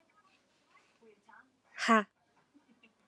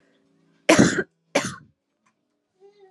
exhalation_length: 3.1 s
exhalation_amplitude: 8562
exhalation_signal_mean_std_ratio: 0.21
cough_length: 2.9 s
cough_amplitude: 31639
cough_signal_mean_std_ratio: 0.29
survey_phase: alpha (2021-03-01 to 2021-08-12)
age: 18-44
gender: Female
wearing_mask: 'No'
symptom_cough_any: true
symptom_shortness_of_breath: true
symptom_abdominal_pain: true
symptom_diarrhoea: true
symptom_fatigue: true
symptom_fever_high_temperature: true
symptom_headache: true
symptom_change_to_sense_of_smell_or_taste: true
symptom_loss_of_taste: true
symptom_onset: 4 days
smoker_status: Never smoked
respiratory_condition_asthma: false
respiratory_condition_other: false
recruitment_source: Test and Trace
submission_delay: 2 days
covid_test_result: Positive
covid_test_method: RT-qPCR
covid_ct_value: 26.8
covid_ct_gene: N gene
covid_ct_mean: 27.1
covid_viral_load: 1300 copies/ml
covid_viral_load_category: Minimal viral load (< 10K copies/ml)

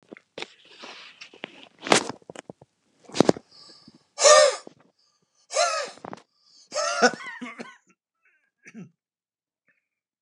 exhalation_length: 10.2 s
exhalation_amplitude: 32512
exhalation_signal_mean_std_ratio: 0.27
survey_phase: beta (2021-08-13 to 2022-03-07)
age: 65+
gender: Male
wearing_mask: 'No'
symptom_none: true
smoker_status: Never smoked
respiratory_condition_asthma: false
respiratory_condition_other: false
recruitment_source: REACT
submission_delay: 2 days
covid_test_result: Negative
covid_test_method: RT-qPCR
influenza_a_test_result: Negative
influenza_b_test_result: Negative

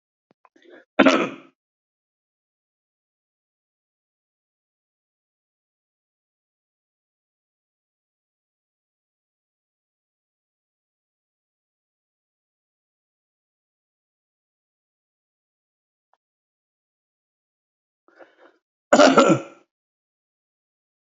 cough_length: 21.1 s
cough_amplitude: 28408
cough_signal_mean_std_ratio: 0.14
survey_phase: alpha (2021-03-01 to 2021-08-12)
age: 65+
gender: Male
wearing_mask: 'No'
symptom_none: true
smoker_status: Never smoked
respiratory_condition_asthma: false
respiratory_condition_other: false
recruitment_source: REACT
submission_delay: 2 days
covid_test_result: Negative
covid_test_method: RT-qPCR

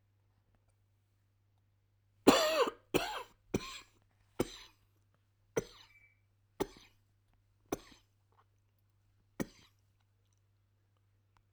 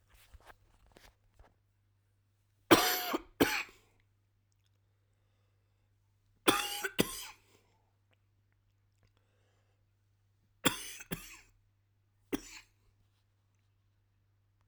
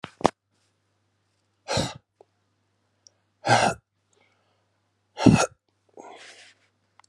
cough_length: 11.5 s
cough_amplitude: 12943
cough_signal_mean_std_ratio: 0.22
three_cough_length: 14.7 s
three_cough_amplitude: 12932
three_cough_signal_mean_std_ratio: 0.22
exhalation_length: 7.1 s
exhalation_amplitude: 32768
exhalation_signal_mean_std_ratio: 0.24
survey_phase: alpha (2021-03-01 to 2021-08-12)
age: 45-64
gender: Male
wearing_mask: 'No'
symptom_cough_any: true
symptom_fatigue: true
symptom_headache: true
symptom_change_to_sense_of_smell_or_taste: true
symptom_onset: 2 days
smoker_status: Never smoked
respiratory_condition_asthma: false
respiratory_condition_other: false
recruitment_source: Test and Trace
submission_delay: 2 days
covid_test_result: Positive
covid_test_method: RT-qPCR
covid_ct_value: 26.8
covid_ct_gene: S gene
covid_ct_mean: 26.9
covid_viral_load: 1500 copies/ml
covid_viral_load_category: Minimal viral load (< 10K copies/ml)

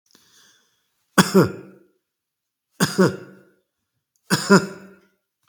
three_cough_length: 5.5 s
three_cough_amplitude: 32760
three_cough_signal_mean_std_ratio: 0.29
survey_phase: beta (2021-08-13 to 2022-03-07)
age: 45-64
gender: Male
wearing_mask: 'No'
symptom_none: true
smoker_status: Never smoked
respiratory_condition_asthma: false
respiratory_condition_other: false
recruitment_source: REACT
submission_delay: 8 days
covid_test_result: Negative
covid_test_method: RT-qPCR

